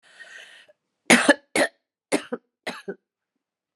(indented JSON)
{
  "three_cough_length": "3.8 s",
  "three_cough_amplitude": 31477,
  "three_cough_signal_mean_std_ratio": 0.27,
  "survey_phase": "beta (2021-08-13 to 2022-03-07)",
  "age": "45-64",
  "gender": "Female",
  "wearing_mask": "No",
  "symptom_cough_any": true,
  "symptom_new_continuous_cough": true,
  "symptom_runny_or_blocked_nose": true,
  "symptom_shortness_of_breath": true,
  "symptom_sore_throat": true,
  "symptom_fatigue": true,
  "symptom_fever_high_temperature": true,
  "symptom_headache": true,
  "symptom_onset": "4 days",
  "smoker_status": "Ex-smoker",
  "respiratory_condition_asthma": false,
  "respiratory_condition_other": false,
  "recruitment_source": "Test and Trace",
  "submission_delay": "1 day",
  "covid_test_result": "Positive",
  "covid_test_method": "RT-qPCR",
  "covid_ct_value": 15.5,
  "covid_ct_gene": "N gene",
  "covid_ct_mean": 15.6,
  "covid_viral_load": "7800000 copies/ml",
  "covid_viral_load_category": "High viral load (>1M copies/ml)"
}